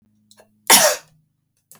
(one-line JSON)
{"cough_length": "1.8 s", "cough_amplitude": 32768, "cough_signal_mean_std_ratio": 0.3, "survey_phase": "beta (2021-08-13 to 2022-03-07)", "age": "45-64", "gender": "Female", "wearing_mask": "No", "symptom_runny_or_blocked_nose": true, "smoker_status": "Ex-smoker", "respiratory_condition_asthma": false, "respiratory_condition_other": false, "recruitment_source": "REACT", "submission_delay": "1 day", "covid_test_result": "Negative", "covid_test_method": "RT-qPCR"}